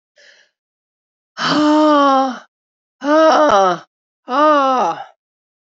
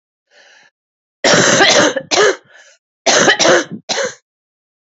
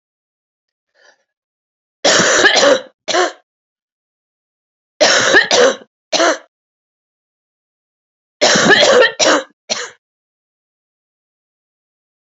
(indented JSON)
{
  "exhalation_length": "5.6 s",
  "exhalation_amplitude": 27623,
  "exhalation_signal_mean_std_ratio": 0.56,
  "cough_length": "4.9 s",
  "cough_amplitude": 32768,
  "cough_signal_mean_std_ratio": 0.51,
  "three_cough_length": "12.4 s",
  "three_cough_amplitude": 32768,
  "three_cough_signal_mean_std_ratio": 0.4,
  "survey_phase": "beta (2021-08-13 to 2022-03-07)",
  "age": "45-64",
  "gender": "Female",
  "wearing_mask": "No",
  "symptom_cough_any": true,
  "symptom_runny_or_blocked_nose": true,
  "symptom_sore_throat": true,
  "symptom_abdominal_pain": true,
  "symptom_fatigue": true,
  "symptom_fever_high_temperature": true,
  "symptom_headache": true,
  "symptom_change_to_sense_of_smell_or_taste": true,
  "symptom_loss_of_taste": true,
  "symptom_other": true,
  "symptom_onset": "5 days",
  "smoker_status": "Never smoked",
  "respiratory_condition_asthma": false,
  "respiratory_condition_other": false,
  "recruitment_source": "Test and Trace",
  "submission_delay": "3 days",
  "covid_test_result": "Positive",
  "covid_test_method": "RT-qPCR"
}